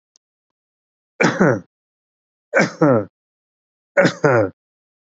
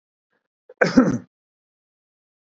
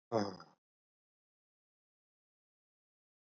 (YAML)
three_cough_length: 5.0 s
three_cough_amplitude: 27322
three_cough_signal_mean_std_ratio: 0.38
cough_length: 2.5 s
cough_amplitude: 27371
cough_signal_mean_std_ratio: 0.26
exhalation_length: 3.3 s
exhalation_amplitude: 3018
exhalation_signal_mean_std_ratio: 0.18
survey_phase: beta (2021-08-13 to 2022-03-07)
age: 65+
gender: Male
wearing_mask: 'No'
symptom_none: true
smoker_status: Ex-smoker
respiratory_condition_asthma: false
respiratory_condition_other: false
recruitment_source: REACT
submission_delay: 1 day
covid_test_result: Negative
covid_test_method: RT-qPCR
influenza_a_test_result: Negative
influenza_b_test_result: Negative